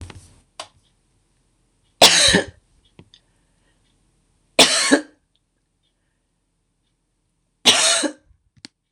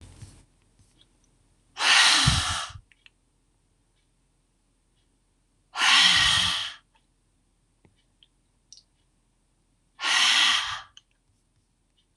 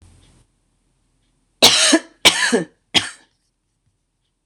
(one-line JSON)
{"three_cough_length": "8.9 s", "three_cough_amplitude": 26028, "three_cough_signal_mean_std_ratio": 0.29, "exhalation_length": "12.2 s", "exhalation_amplitude": 19950, "exhalation_signal_mean_std_ratio": 0.37, "cough_length": "4.5 s", "cough_amplitude": 26028, "cough_signal_mean_std_ratio": 0.33, "survey_phase": "beta (2021-08-13 to 2022-03-07)", "age": "45-64", "gender": "Female", "wearing_mask": "No", "symptom_cough_any": true, "symptom_runny_or_blocked_nose": true, "symptom_onset": "12 days", "smoker_status": "Ex-smoker", "respiratory_condition_asthma": false, "respiratory_condition_other": false, "recruitment_source": "REACT", "submission_delay": "1 day", "covid_test_result": "Negative", "covid_test_method": "RT-qPCR", "influenza_a_test_result": "Negative", "influenza_b_test_result": "Negative"}